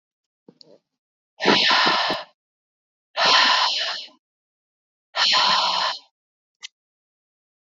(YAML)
exhalation_length: 7.8 s
exhalation_amplitude: 23613
exhalation_signal_mean_std_ratio: 0.46
survey_phase: beta (2021-08-13 to 2022-03-07)
age: 18-44
gender: Female
wearing_mask: 'No'
symptom_cough_any: true
symptom_runny_or_blocked_nose: true
symptom_shortness_of_breath: true
symptom_fatigue: true
smoker_status: Never smoked
respiratory_condition_asthma: false
respiratory_condition_other: false
recruitment_source: Test and Trace
submission_delay: 1 day
covid_test_result: Positive
covid_test_method: LFT